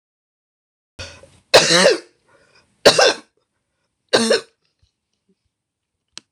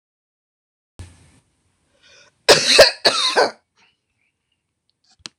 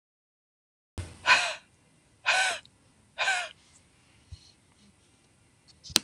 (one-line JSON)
{"three_cough_length": "6.3 s", "three_cough_amplitude": 26028, "three_cough_signal_mean_std_ratio": 0.3, "cough_length": "5.4 s", "cough_amplitude": 26028, "cough_signal_mean_std_ratio": 0.29, "exhalation_length": "6.0 s", "exhalation_amplitude": 26028, "exhalation_signal_mean_std_ratio": 0.31, "survey_phase": "beta (2021-08-13 to 2022-03-07)", "age": "45-64", "gender": "Female", "wearing_mask": "No", "symptom_cough_any": true, "smoker_status": "Never smoked", "respiratory_condition_asthma": false, "respiratory_condition_other": false, "recruitment_source": "REACT", "submission_delay": "2 days", "covid_test_result": "Negative", "covid_test_method": "RT-qPCR", "influenza_a_test_result": "Negative", "influenza_b_test_result": "Negative"}